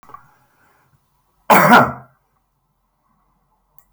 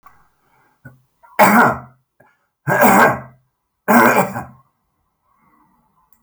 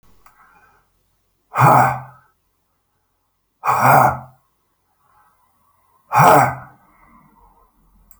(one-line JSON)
{"cough_length": "3.9 s", "cough_amplitude": 32767, "cough_signal_mean_std_ratio": 0.26, "three_cough_length": "6.2 s", "three_cough_amplitude": 32768, "three_cough_signal_mean_std_ratio": 0.38, "exhalation_length": "8.2 s", "exhalation_amplitude": 32768, "exhalation_signal_mean_std_ratio": 0.33, "survey_phase": "beta (2021-08-13 to 2022-03-07)", "age": "65+", "gender": "Male", "wearing_mask": "No", "symptom_none": true, "smoker_status": "Never smoked", "respiratory_condition_asthma": false, "respiratory_condition_other": false, "recruitment_source": "REACT", "submission_delay": "4 days", "covid_test_result": "Negative", "covid_test_method": "RT-qPCR"}